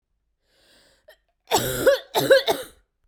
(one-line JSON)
{"three_cough_length": "3.1 s", "three_cough_amplitude": 22328, "three_cough_signal_mean_std_ratio": 0.4, "survey_phase": "beta (2021-08-13 to 2022-03-07)", "age": "18-44", "gender": "Female", "wearing_mask": "No", "symptom_new_continuous_cough": true, "symptom_runny_or_blocked_nose": true, "symptom_fatigue": true, "symptom_headache": true, "symptom_onset": "5 days", "smoker_status": "Never smoked", "respiratory_condition_asthma": false, "respiratory_condition_other": false, "recruitment_source": "Test and Trace", "submission_delay": "1 day", "covid_test_result": "Negative", "covid_test_method": "RT-qPCR"}